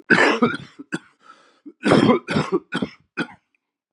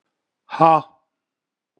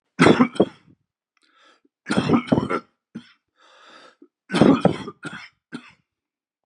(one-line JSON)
{"cough_length": "3.9 s", "cough_amplitude": 29996, "cough_signal_mean_std_ratio": 0.45, "exhalation_length": "1.8 s", "exhalation_amplitude": 31222, "exhalation_signal_mean_std_ratio": 0.27, "three_cough_length": "6.7 s", "three_cough_amplitude": 29490, "three_cough_signal_mean_std_ratio": 0.34, "survey_phase": "beta (2021-08-13 to 2022-03-07)", "age": "45-64", "gender": "Male", "wearing_mask": "No", "symptom_cough_any": true, "symptom_runny_or_blocked_nose": true, "symptom_sore_throat": true, "symptom_fatigue": true, "symptom_fever_high_temperature": true, "symptom_headache": true, "symptom_onset": "4 days", "smoker_status": "Never smoked", "respiratory_condition_asthma": false, "respiratory_condition_other": false, "recruitment_source": "Test and Trace", "submission_delay": "3 days", "covid_test_result": "Positive", "covid_test_method": "RT-qPCR", "covid_ct_value": 12.4, "covid_ct_gene": "ORF1ab gene"}